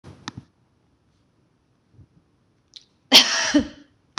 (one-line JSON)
{"cough_length": "4.2 s", "cough_amplitude": 26028, "cough_signal_mean_std_ratio": 0.25, "survey_phase": "beta (2021-08-13 to 2022-03-07)", "age": "45-64", "gender": "Female", "wearing_mask": "No", "symptom_none": true, "smoker_status": "Never smoked", "respiratory_condition_asthma": false, "respiratory_condition_other": false, "recruitment_source": "REACT", "submission_delay": "2 days", "covid_test_result": "Negative", "covid_test_method": "RT-qPCR", "influenza_a_test_result": "Negative", "influenza_b_test_result": "Negative"}